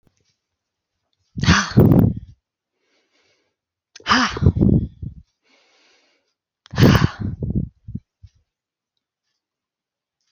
exhalation_length: 10.3 s
exhalation_amplitude: 29217
exhalation_signal_mean_std_ratio: 0.34
survey_phase: alpha (2021-03-01 to 2021-08-12)
age: 45-64
gender: Female
wearing_mask: 'No'
symptom_none: true
smoker_status: Never smoked
respiratory_condition_asthma: false
respiratory_condition_other: false
recruitment_source: REACT
submission_delay: 2 days
covid_test_result: Negative
covid_test_method: RT-qPCR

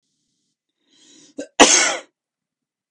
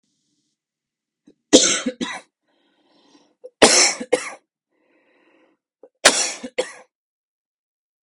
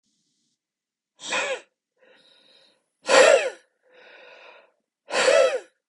cough_length: 2.9 s
cough_amplitude: 32768
cough_signal_mean_std_ratio: 0.27
three_cough_length: 8.0 s
three_cough_amplitude: 32768
three_cough_signal_mean_std_ratio: 0.28
exhalation_length: 5.9 s
exhalation_amplitude: 26317
exhalation_signal_mean_std_ratio: 0.34
survey_phase: beta (2021-08-13 to 2022-03-07)
age: 18-44
gender: Male
wearing_mask: 'No'
symptom_none: true
symptom_onset: 3 days
smoker_status: Ex-smoker
respiratory_condition_asthma: false
respiratory_condition_other: false
recruitment_source: REACT
submission_delay: 1 day
covid_test_result: Negative
covid_test_method: RT-qPCR
influenza_a_test_result: Unknown/Void
influenza_b_test_result: Unknown/Void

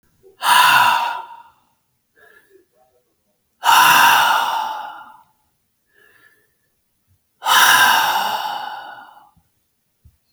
exhalation_length: 10.3 s
exhalation_amplitude: 32767
exhalation_signal_mean_std_ratio: 0.45
survey_phase: beta (2021-08-13 to 2022-03-07)
age: 65+
gender: Male
wearing_mask: 'No'
symptom_none: true
smoker_status: Ex-smoker
respiratory_condition_asthma: false
respiratory_condition_other: false
recruitment_source: REACT
submission_delay: 1 day
covid_test_result: Negative
covid_test_method: RT-qPCR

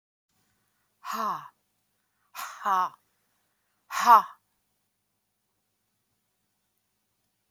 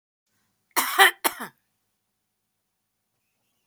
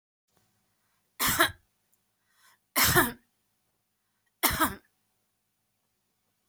exhalation_length: 7.5 s
exhalation_amplitude: 20021
exhalation_signal_mean_std_ratio: 0.22
cough_length: 3.7 s
cough_amplitude: 27359
cough_signal_mean_std_ratio: 0.23
three_cough_length: 6.5 s
three_cough_amplitude: 13720
three_cough_signal_mean_std_ratio: 0.29
survey_phase: beta (2021-08-13 to 2022-03-07)
age: 65+
gender: Female
wearing_mask: 'No'
symptom_none: true
smoker_status: Never smoked
respiratory_condition_asthma: false
respiratory_condition_other: false
recruitment_source: REACT
submission_delay: 2 days
covid_test_result: Negative
covid_test_method: RT-qPCR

